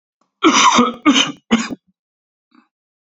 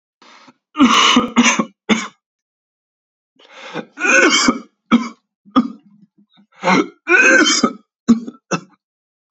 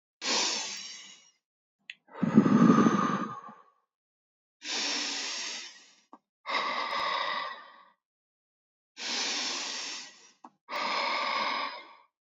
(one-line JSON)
{"cough_length": "3.2 s", "cough_amplitude": 30329, "cough_signal_mean_std_ratio": 0.44, "three_cough_length": "9.3 s", "three_cough_amplitude": 31811, "three_cough_signal_mean_std_ratio": 0.46, "exhalation_length": "12.2 s", "exhalation_amplitude": 14379, "exhalation_signal_mean_std_ratio": 0.51, "survey_phase": "beta (2021-08-13 to 2022-03-07)", "age": "18-44", "gender": "Male", "wearing_mask": "No", "symptom_cough_any": true, "symptom_sore_throat": true, "symptom_diarrhoea": true, "symptom_fatigue": true, "symptom_headache": true, "symptom_change_to_sense_of_smell_or_taste": true, "smoker_status": "Ex-smoker", "respiratory_condition_asthma": false, "respiratory_condition_other": false, "recruitment_source": "Test and Trace", "submission_delay": "2 days", "covid_test_result": "Positive", "covid_test_method": "RT-qPCR", "covid_ct_value": 16.5, "covid_ct_gene": "ORF1ab gene", "covid_ct_mean": 16.9, "covid_viral_load": "2900000 copies/ml", "covid_viral_load_category": "High viral load (>1M copies/ml)"}